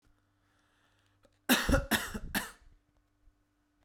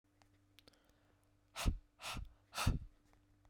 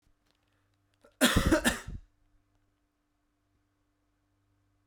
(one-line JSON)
{"three_cough_length": "3.8 s", "three_cough_amplitude": 8533, "three_cough_signal_mean_std_ratio": 0.32, "exhalation_length": "3.5 s", "exhalation_amplitude": 2725, "exhalation_signal_mean_std_ratio": 0.33, "cough_length": "4.9 s", "cough_amplitude": 10059, "cough_signal_mean_std_ratio": 0.26, "survey_phase": "beta (2021-08-13 to 2022-03-07)", "age": "18-44", "gender": "Male", "wearing_mask": "No", "symptom_none": true, "smoker_status": "Ex-smoker", "respiratory_condition_asthma": false, "respiratory_condition_other": false, "recruitment_source": "REACT", "submission_delay": "1 day", "covid_test_result": "Negative", "covid_test_method": "RT-qPCR"}